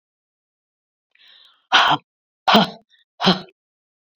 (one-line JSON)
{"exhalation_length": "4.2 s", "exhalation_amplitude": 29824, "exhalation_signal_mean_std_ratio": 0.3, "survey_phase": "beta (2021-08-13 to 2022-03-07)", "age": "45-64", "gender": "Female", "wearing_mask": "No", "symptom_none": true, "smoker_status": "Ex-smoker", "respiratory_condition_asthma": false, "respiratory_condition_other": false, "recruitment_source": "REACT", "submission_delay": "1 day", "covid_test_result": "Negative", "covid_test_method": "RT-qPCR"}